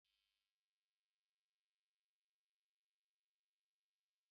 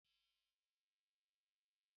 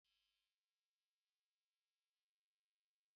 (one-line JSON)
{"exhalation_length": "4.3 s", "exhalation_amplitude": 9, "exhalation_signal_mean_std_ratio": 0.21, "cough_length": "2.0 s", "cough_amplitude": 10, "cough_signal_mean_std_ratio": 0.32, "three_cough_length": "3.2 s", "three_cough_amplitude": 9, "three_cough_signal_mean_std_ratio": 0.28, "survey_phase": "beta (2021-08-13 to 2022-03-07)", "age": "45-64", "gender": "Male", "wearing_mask": "No", "symptom_cough_any": true, "symptom_runny_or_blocked_nose": true, "symptom_sore_throat": true, "symptom_fever_high_temperature": true, "symptom_headache": true, "symptom_onset": "4 days", "smoker_status": "Ex-smoker", "respiratory_condition_asthma": false, "respiratory_condition_other": false, "recruitment_source": "Test and Trace", "submission_delay": "2 days", "covid_test_result": "Positive", "covid_test_method": "RT-qPCR", "covid_ct_value": 16.2, "covid_ct_gene": "ORF1ab gene"}